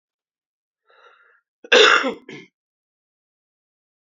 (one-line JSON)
{"cough_length": "4.2 s", "cough_amplitude": 30117, "cough_signal_mean_std_ratio": 0.24, "survey_phase": "beta (2021-08-13 to 2022-03-07)", "age": "18-44", "gender": "Male", "wearing_mask": "No", "symptom_cough_any": true, "symptom_runny_or_blocked_nose": true, "symptom_abdominal_pain": true, "symptom_diarrhoea": true, "symptom_onset": "3 days", "smoker_status": "Ex-smoker", "respiratory_condition_asthma": true, "respiratory_condition_other": true, "recruitment_source": "REACT", "submission_delay": "0 days", "covid_test_result": "Negative", "covid_test_method": "RT-qPCR"}